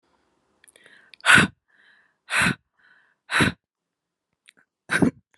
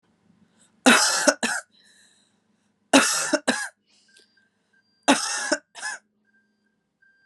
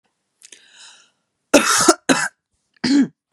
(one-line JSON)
{"exhalation_length": "5.4 s", "exhalation_amplitude": 29227, "exhalation_signal_mean_std_ratio": 0.29, "three_cough_length": "7.3 s", "three_cough_amplitude": 31701, "three_cough_signal_mean_std_ratio": 0.35, "cough_length": "3.3 s", "cough_amplitude": 32767, "cough_signal_mean_std_ratio": 0.39, "survey_phase": "beta (2021-08-13 to 2022-03-07)", "age": "18-44", "gender": "Female", "wearing_mask": "No", "symptom_cough_any": true, "symptom_sore_throat": true, "symptom_fatigue": true, "symptom_headache": true, "smoker_status": "Never smoked", "respiratory_condition_asthma": false, "respiratory_condition_other": false, "recruitment_source": "Test and Trace", "submission_delay": "2 days", "covid_test_result": "Positive", "covid_test_method": "RT-qPCR", "covid_ct_value": 27.7, "covid_ct_gene": "N gene"}